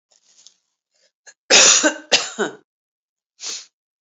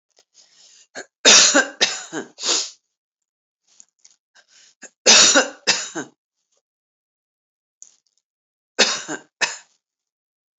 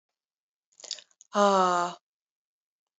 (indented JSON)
{
  "cough_length": "4.0 s",
  "cough_amplitude": 32696,
  "cough_signal_mean_std_ratio": 0.33,
  "three_cough_length": "10.6 s",
  "three_cough_amplitude": 32768,
  "three_cough_signal_mean_std_ratio": 0.3,
  "exhalation_length": "3.0 s",
  "exhalation_amplitude": 11891,
  "exhalation_signal_mean_std_ratio": 0.32,
  "survey_phase": "beta (2021-08-13 to 2022-03-07)",
  "age": "65+",
  "gender": "Female",
  "wearing_mask": "No",
  "symptom_none": true,
  "smoker_status": "Never smoked",
  "respiratory_condition_asthma": false,
  "respiratory_condition_other": false,
  "recruitment_source": "REACT",
  "submission_delay": "3 days",
  "covid_test_result": "Negative",
  "covid_test_method": "RT-qPCR",
  "influenza_a_test_result": "Negative",
  "influenza_b_test_result": "Negative"
}